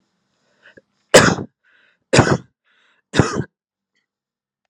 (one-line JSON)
{"three_cough_length": "4.7 s", "three_cough_amplitude": 32768, "three_cough_signal_mean_std_ratio": 0.27, "survey_phase": "beta (2021-08-13 to 2022-03-07)", "age": "18-44", "gender": "Male", "wearing_mask": "No", "symptom_none": true, "symptom_onset": "13 days", "smoker_status": "Current smoker (e-cigarettes or vapes only)", "respiratory_condition_asthma": false, "respiratory_condition_other": false, "recruitment_source": "REACT", "submission_delay": "1 day", "covid_test_result": "Negative", "covid_test_method": "RT-qPCR", "influenza_a_test_result": "Negative", "influenza_b_test_result": "Negative"}